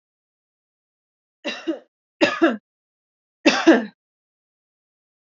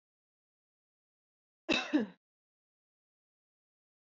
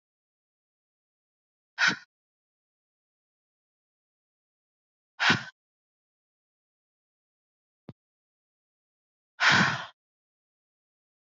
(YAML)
three_cough_length: 5.4 s
three_cough_amplitude: 27428
three_cough_signal_mean_std_ratio: 0.27
cough_length: 4.1 s
cough_amplitude: 4484
cough_signal_mean_std_ratio: 0.21
exhalation_length: 11.3 s
exhalation_amplitude: 12797
exhalation_signal_mean_std_ratio: 0.2
survey_phase: beta (2021-08-13 to 2022-03-07)
age: 18-44
gender: Female
wearing_mask: 'No'
symptom_none: true
smoker_status: Ex-smoker
respiratory_condition_asthma: false
respiratory_condition_other: false
recruitment_source: REACT
submission_delay: 0 days
covid_test_result: Negative
covid_test_method: RT-qPCR
influenza_a_test_result: Negative
influenza_b_test_result: Negative